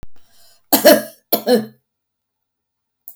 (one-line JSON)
{"cough_length": "3.2 s", "cough_amplitude": 32768, "cough_signal_mean_std_ratio": 0.33, "survey_phase": "beta (2021-08-13 to 2022-03-07)", "age": "65+", "gender": "Female", "wearing_mask": "No", "symptom_none": true, "symptom_onset": "7 days", "smoker_status": "Never smoked", "respiratory_condition_asthma": false, "respiratory_condition_other": false, "recruitment_source": "REACT", "submission_delay": "0 days", "covid_test_result": "Negative", "covid_test_method": "RT-qPCR", "influenza_a_test_result": "Negative", "influenza_b_test_result": "Negative"}